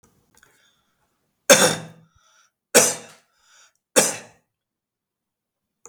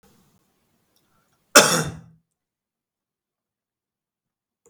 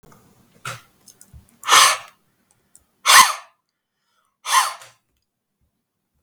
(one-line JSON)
{"three_cough_length": "5.9 s", "three_cough_amplitude": 32768, "three_cough_signal_mean_std_ratio": 0.24, "cough_length": "4.7 s", "cough_amplitude": 32768, "cough_signal_mean_std_ratio": 0.18, "exhalation_length": "6.2 s", "exhalation_amplitude": 32768, "exhalation_signal_mean_std_ratio": 0.28, "survey_phase": "beta (2021-08-13 to 2022-03-07)", "age": "18-44", "gender": "Male", "wearing_mask": "No", "symptom_none": true, "smoker_status": "Ex-smoker", "respiratory_condition_asthma": false, "respiratory_condition_other": false, "recruitment_source": "REACT", "submission_delay": "0 days", "covid_test_result": "Negative", "covid_test_method": "RT-qPCR", "influenza_a_test_result": "Negative", "influenza_b_test_result": "Negative"}